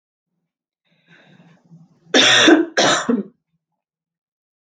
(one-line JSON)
{"cough_length": "4.6 s", "cough_amplitude": 32768, "cough_signal_mean_std_ratio": 0.37, "survey_phase": "beta (2021-08-13 to 2022-03-07)", "age": "45-64", "gender": "Female", "wearing_mask": "No", "symptom_cough_any": true, "symptom_shortness_of_breath": true, "symptom_sore_throat": true, "smoker_status": "Never smoked", "respiratory_condition_asthma": false, "respiratory_condition_other": false, "recruitment_source": "Test and Trace", "submission_delay": "2 days", "covid_test_result": "Positive", "covid_test_method": "RT-qPCR", "covid_ct_value": 35.5, "covid_ct_gene": "ORF1ab gene"}